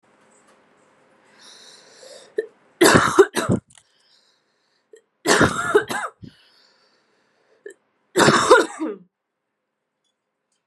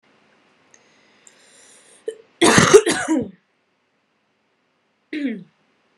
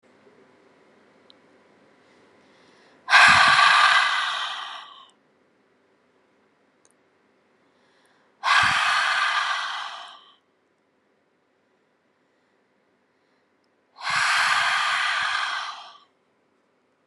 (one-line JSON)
{"three_cough_length": "10.7 s", "three_cough_amplitude": 32768, "three_cough_signal_mean_std_ratio": 0.32, "cough_length": "6.0 s", "cough_amplitude": 32768, "cough_signal_mean_std_ratio": 0.29, "exhalation_length": "17.1 s", "exhalation_amplitude": 28036, "exhalation_signal_mean_std_ratio": 0.41, "survey_phase": "beta (2021-08-13 to 2022-03-07)", "age": "18-44", "gender": "Female", "wearing_mask": "No", "symptom_runny_or_blocked_nose": true, "symptom_fever_high_temperature": true, "symptom_headache": true, "symptom_other": true, "smoker_status": "Never smoked", "respiratory_condition_asthma": false, "respiratory_condition_other": false, "recruitment_source": "Test and Trace", "submission_delay": "1 day", "covid_test_result": "Positive", "covid_test_method": "RT-qPCR", "covid_ct_value": 16.1, "covid_ct_gene": "ORF1ab gene", "covid_ct_mean": 16.2, "covid_viral_load": "5000000 copies/ml", "covid_viral_load_category": "High viral load (>1M copies/ml)"}